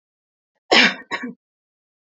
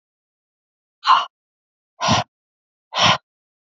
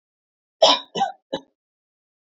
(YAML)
cough_length: 2.0 s
cough_amplitude: 27258
cough_signal_mean_std_ratio: 0.3
exhalation_length: 3.8 s
exhalation_amplitude: 26304
exhalation_signal_mean_std_ratio: 0.31
three_cough_length: 2.2 s
three_cough_amplitude: 24355
three_cough_signal_mean_std_ratio: 0.29
survey_phase: beta (2021-08-13 to 2022-03-07)
age: 18-44
gender: Female
wearing_mask: 'No'
symptom_sore_throat: true
symptom_diarrhoea: true
symptom_onset: 12 days
smoker_status: Never smoked
respiratory_condition_asthma: false
respiratory_condition_other: false
recruitment_source: REACT
submission_delay: 1 day
covid_test_result: Negative
covid_test_method: RT-qPCR
influenza_a_test_result: Unknown/Void
influenza_b_test_result: Unknown/Void